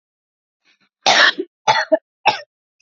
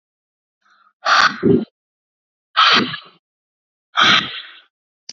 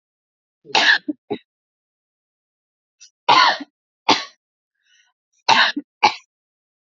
{"cough_length": "2.8 s", "cough_amplitude": 31605, "cough_signal_mean_std_ratio": 0.37, "exhalation_length": "5.1 s", "exhalation_amplitude": 30782, "exhalation_signal_mean_std_ratio": 0.39, "three_cough_length": "6.8 s", "three_cough_amplitude": 32757, "three_cough_signal_mean_std_ratio": 0.31, "survey_phase": "beta (2021-08-13 to 2022-03-07)", "age": "18-44", "gender": "Female", "wearing_mask": "No", "symptom_cough_any": true, "smoker_status": "Current smoker (e-cigarettes or vapes only)", "respiratory_condition_asthma": true, "respiratory_condition_other": false, "recruitment_source": "REACT", "submission_delay": "2 days", "covid_test_result": "Negative", "covid_test_method": "RT-qPCR", "influenza_a_test_result": "Negative", "influenza_b_test_result": "Negative"}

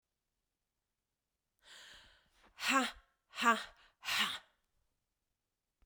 {"exhalation_length": "5.9 s", "exhalation_amplitude": 5513, "exhalation_signal_mean_std_ratio": 0.29, "survey_phase": "beta (2021-08-13 to 2022-03-07)", "age": "45-64", "gender": "Female", "wearing_mask": "No", "symptom_cough_any": true, "symptom_runny_or_blocked_nose": true, "symptom_sore_throat": true, "symptom_fatigue": true, "symptom_change_to_sense_of_smell_or_taste": true, "symptom_loss_of_taste": true, "symptom_onset": "6 days", "smoker_status": "Ex-smoker", "respiratory_condition_asthma": false, "respiratory_condition_other": false, "recruitment_source": "Test and Trace", "submission_delay": "2 days", "covid_test_result": "Positive", "covid_test_method": "RT-qPCR", "covid_ct_value": 17.3, "covid_ct_gene": "ORF1ab gene", "covid_ct_mean": 17.7, "covid_viral_load": "1500000 copies/ml", "covid_viral_load_category": "High viral load (>1M copies/ml)"}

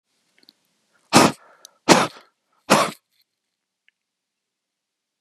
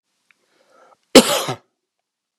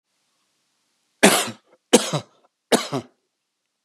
{"exhalation_length": "5.2 s", "exhalation_amplitude": 32768, "exhalation_signal_mean_std_ratio": 0.24, "cough_length": "2.4 s", "cough_amplitude": 32768, "cough_signal_mean_std_ratio": 0.23, "three_cough_length": "3.8 s", "three_cough_amplitude": 32767, "three_cough_signal_mean_std_ratio": 0.28, "survey_phase": "beta (2021-08-13 to 2022-03-07)", "age": "45-64", "gender": "Male", "wearing_mask": "No", "symptom_cough_any": true, "symptom_runny_or_blocked_nose": true, "smoker_status": "Ex-smoker", "respiratory_condition_asthma": false, "respiratory_condition_other": false, "recruitment_source": "Test and Trace", "submission_delay": "2 days", "covid_test_result": "Positive", "covid_test_method": "RT-qPCR", "covid_ct_value": 26.7, "covid_ct_gene": "N gene"}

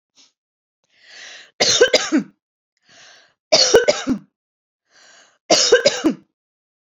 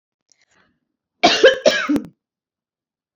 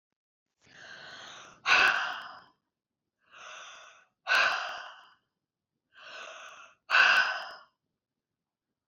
{"three_cough_length": "7.0 s", "three_cough_amplitude": 32767, "three_cough_signal_mean_std_ratio": 0.38, "cough_length": "3.2 s", "cough_amplitude": 28216, "cough_signal_mean_std_ratio": 0.34, "exhalation_length": "8.9 s", "exhalation_amplitude": 12391, "exhalation_signal_mean_std_ratio": 0.35, "survey_phase": "beta (2021-08-13 to 2022-03-07)", "age": "45-64", "gender": "Female", "wearing_mask": "No", "symptom_none": true, "smoker_status": "Never smoked", "respiratory_condition_asthma": true, "respiratory_condition_other": false, "recruitment_source": "REACT", "submission_delay": "1 day", "covid_test_result": "Negative", "covid_test_method": "RT-qPCR", "covid_ct_value": 40.0, "covid_ct_gene": "N gene"}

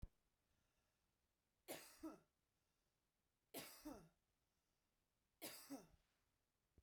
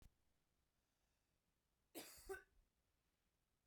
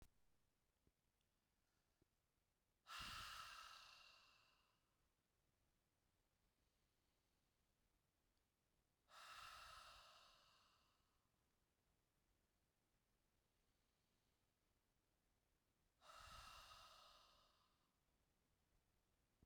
{"three_cough_length": "6.8 s", "three_cough_amplitude": 337, "three_cough_signal_mean_std_ratio": 0.36, "cough_length": "3.7 s", "cough_amplitude": 345, "cough_signal_mean_std_ratio": 0.31, "exhalation_length": "19.5 s", "exhalation_amplitude": 213, "exhalation_signal_mean_std_ratio": 0.41, "survey_phase": "beta (2021-08-13 to 2022-03-07)", "age": "45-64", "gender": "Female", "wearing_mask": "No", "symptom_none": true, "smoker_status": "Ex-smoker", "respiratory_condition_asthma": false, "respiratory_condition_other": false, "recruitment_source": "REACT", "submission_delay": "2 days", "covid_test_result": "Negative", "covid_test_method": "RT-qPCR"}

